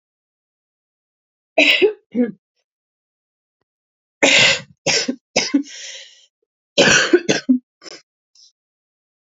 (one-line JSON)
{"three_cough_length": "9.4 s", "three_cough_amplitude": 30260, "three_cough_signal_mean_std_ratio": 0.36, "survey_phase": "beta (2021-08-13 to 2022-03-07)", "age": "45-64", "gender": "Female", "wearing_mask": "No", "symptom_cough_any": true, "symptom_runny_or_blocked_nose": true, "symptom_sore_throat": true, "symptom_abdominal_pain": true, "symptom_diarrhoea": true, "symptom_fatigue": true, "symptom_fever_high_temperature": true, "symptom_headache": true, "symptom_other": true, "smoker_status": "Never smoked", "respiratory_condition_asthma": false, "respiratory_condition_other": false, "recruitment_source": "Test and Trace", "submission_delay": "1 day", "covid_test_result": "Positive", "covid_test_method": "RT-qPCR", "covid_ct_value": 22.4, "covid_ct_gene": "N gene"}